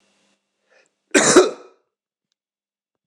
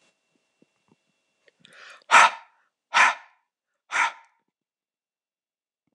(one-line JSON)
{"cough_length": "3.1 s", "cough_amplitude": 26028, "cough_signal_mean_std_ratio": 0.26, "exhalation_length": "5.9 s", "exhalation_amplitude": 25345, "exhalation_signal_mean_std_ratio": 0.23, "survey_phase": "beta (2021-08-13 to 2022-03-07)", "age": "18-44", "gender": "Male", "wearing_mask": "No", "symptom_runny_or_blocked_nose": true, "smoker_status": "Never smoked", "respiratory_condition_asthma": false, "respiratory_condition_other": false, "recruitment_source": "REACT", "submission_delay": "1 day", "covid_test_result": "Negative", "covid_test_method": "RT-qPCR"}